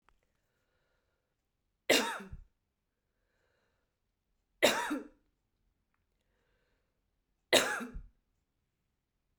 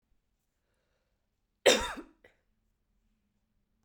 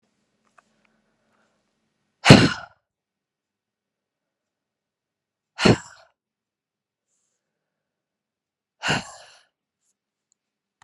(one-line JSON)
{"three_cough_length": "9.4 s", "three_cough_amplitude": 12629, "three_cough_signal_mean_std_ratio": 0.23, "cough_length": "3.8 s", "cough_amplitude": 13865, "cough_signal_mean_std_ratio": 0.18, "exhalation_length": "10.8 s", "exhalation_amplitude": 32768, "exhalation_signal_mean_std_ratio": 0.16, "survey_phase": "beta (2021-08-13 to 2022-03-07)", "age": "18-44", "gender": "Female", "wearing_mask": "No", "symptom_sore_throat": true, "smoker_status": "Never smoked", "respiratory_condition_asthma": false, "respiratory_condition_other": false, "recruitment_source": "Test and Trace", "submission_delay": "1 day", "covid_test_result": "Positive", "covid_test_method": "RT-qPCR", "covid_ct_value": 25.3, "covid_ct_gene": "ORF1ab gene", "covid_ct_mean": 26.0, "covid_viral_load": "3000 copies/ml", "covid_viral_load_category": "Minimal viral load (< 10K copies/ml)"}